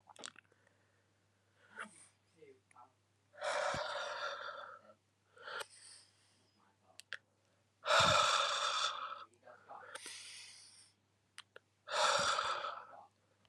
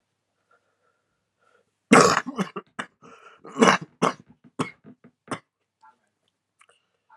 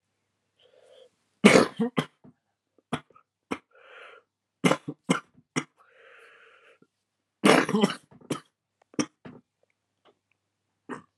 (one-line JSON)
{"exhalation_length": "13.5 s", "exhalation_amplitude": 4567, "exhalation_signal_mean_std_ratio": 0.42, "cough_length": "7.2 s", "cough_amplitude": 32767, "cough_signal_mean_std_ratio": 0.24, "three_cough_length": "11.2 s", "three_cough_amplitude": 31043, "three_cough_signal_mean_std_ratio": 0.25, "survey_phase": "alpha (2021-03-01 to 2021-08-12)", "age": "18-44", "gender": "Male", "wearing_mask": "No", "symptom_cough_any": true, "symptom_fatigue": true, "symptom_fever_high_temperature": true, "symptom_headache": true, "smoker_status": "Never smoked", "respiratory_condition_asthma": false, "respiratory_condition_other": false, "recruitment_source": "Test and Trace", "submission_delay": "2 days", "covid_test_result": "Positive", "covid_test_method": "RT-qPCR"}